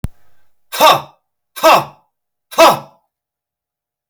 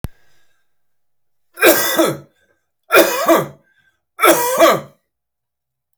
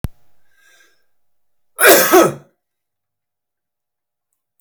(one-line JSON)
{"exhalation_length": "4.1 s", "exhalation_amplitude": 32768, "exhalation_signal_mean_std_ratio": 0.34, "three_cough_length": "6.0 s", "three_cough_amplitude": 32768, "three_cough_signal_mean_std_ratio": 0.42, "cough_length": "4.6 s", "cough_amplitude": 32768, "cough_signal_mean_std_ratio": 0.28, "survey_phase": "beta (2021-08-13 to 2022-03-07)", "age": "45-64", "gender": "Male", "wearing_mask": "Yes", "symptom_none": true, "smoker_status": "Ex-smoker", "respiratory_condition_asthma": false, "respiratory_condition_other": false, "recruitment_source": "REACT", "submission_delay": "1 day", "covid_test_result": "Negative", "covid_test_method": "RT-qPCR"}